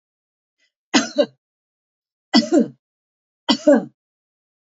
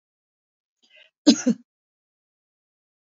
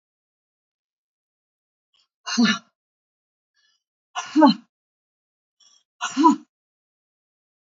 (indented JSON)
{
  "three_cough_length": "4.7 s",
  "three_cough_amplitude": 27255,
  "three_cough_signal_mean_std_ratio": 0.3,
  "cough_length": "3.1 s",
  "cough_amplitude": 26264,
  "cough_signal_mean_std_ratio": 0.18,
  "exhalation_length": "7.7 s",
  "exhalation_amplitude": 26409,
  "exhalation_signal_mean_std_ratio": 0.24,
  "survey_phase": "beta (2021-08-13 to 2022-03-07)",
  "age": "65+",
  "gender": "Female",
  "wearing_mask": "No",
  "symptom_none": true,
  "smoker_status": "Never smoked",
  "respiratory_condition_asthma": false,
  "respiratory_condition_other": false,
  "recruitment_source": "REACT",
  "submission_delay": "0 days",
  "covid_test_result": "Negative",
  "covid_test_method": "RT-qPCR"
}